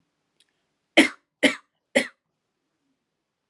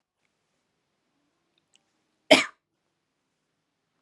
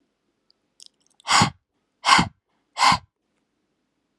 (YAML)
three_cough_length: 3.5 s
three_cough_amplitude: 26576
three_cough_signal_mean_std_ratio: 0.21
cough_length: 4.0 s
cough_amplitude: 27330
cough_signal_mean_std_ratio: 0.13
exhalation_length: 4.2 s
exhalation_amplitude: 29344
exhalation_signal_mean_std_ratio: 0.3
survey_phase: alpha (2021-03-01 to 2021-08-12)
age: 18-44
gender: Female
wearing_mask: 'No'
symptom_none: true
smoker_status: Never smoked
respiratory_condition_asthma: false
respiratory_condition_other: false
recruitment_source: REACT
submission_delay: 4 days
covid_test_result: Negative
covid_test_method: RT-qPCR